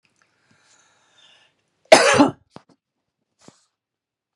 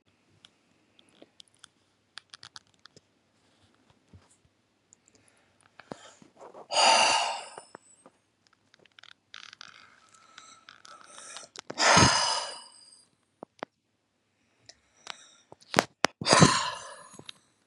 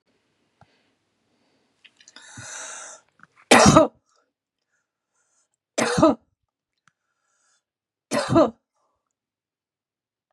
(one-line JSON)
{"cough_length": "4.4 s", "cough_amplitude": 32768, "cough_signal_mean_std_ratio": 0.22, "exhalation_length": "17.7 s", "exhalation_amplitude": 32768, "exhalation_signal_mean_std_ratio": 0.26, "three_cough_length": "10.3 s", "three_cough_amplitude": 32767, "three_cough_signal_mean_std_ratio": 0.24, "survey_phase": "beta (2021-08-13 to 2022-03-07)", "age": "45-64", "gender": "Female", "wearing_mask": "No", "symptom_none": true, "smoker_status": "Ex-smoker", "respiratory_condition_asthma": false, "respiratory_condition_other": true, "recruitment_source": "REACT", "submission_delay": "9 days", "covid_test_result": "Negative", "covid_test_method": "RT-qPCR", "influenza_a_test_result": "Negative", "influenza_b_test_result": "Negative"}